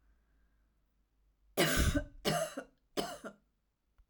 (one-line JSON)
{"three_cough_length": "4.1 s", "three_cough_amplitude": 5102, "three_cough_signal_mean_std_ratio": 0.4, "survey_phase": "alpha (2021-03-01 to 2021-08-12)", "age": "45-64", "gender": "Female", "wearing_mask": "No", "symptom_cough_any": true, "symptom_fatigue": true, "symptom_onset": "12 days", "smoker_status": "Never smoked", "respiratory_condition_asthma": false, "respiratory_condition_other": false, "recruitment_source": "REACT", "submission_delay": "1 day", "covid_test_result": "Negative", "covid_test_method": "RT-qPCR"}